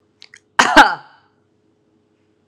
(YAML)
cough_length: 2.5 s
cough_amplitude: 32768
cough_signal_mean_std_ratio: 0.26
survey_phase: beta (2021-08-13 to 2022-03-07)
age: 18-44
gender: Female
wearing_mask: 'No'
symptom_headache: true
symptom_onset: 2 days
smoker_status: Never smoked
respiratory_condition_asthma: false
respiratory_condition_other: false
recruitment_source: Test and Trace
submission_delay: 2 days
covid_test_result: Positive
covid_test_method: RT-qPCR
covid_ct_value: 32.4
covid_ct_gene: ORF1ab gene
covid_ct_mean: 33.3
covid_viral_load: 12 copies/ml
covid_viral_load_category: Minimal viral load (< 10K copies/ml)